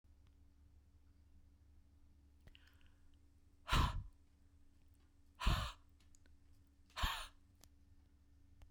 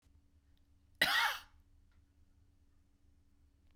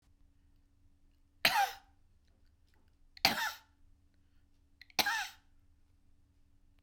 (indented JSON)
{
  "exhalation_length": "8.7 s",
  "exhalation_amplitude": 2821,
  "exhalation_signal_mean_std_ratio": 0.31,
  "cough_length": "3.8 s",
  "cough_amplitude": 6057,
  "cough_signal_mean_std_ratio": 0.28,
  "three_cough_length": "6.8 s",
  "three_cough_amplitude": 12407,
  "three_cough_signal_mean_std_ratio": 0.28,
  "survey_phase": "beta (2021-08-13 to 2022-03-07)",
  "age": "45-64",
  "gender": "Female",
  "wearing_mask": "No",
  "symptom_none": true,
  "smoker_status": "Current smoker (e-cigarettes or vapes only)",
  "respiratory_condition_asthma": false,
  "respiratory_condition_other": false,
  "recruitment_source": "Test and Trace",
  "submission_delay": "1 day",
  "covid_test_result": "Negative",
  "covid_test_method": "RT-qPCR"
}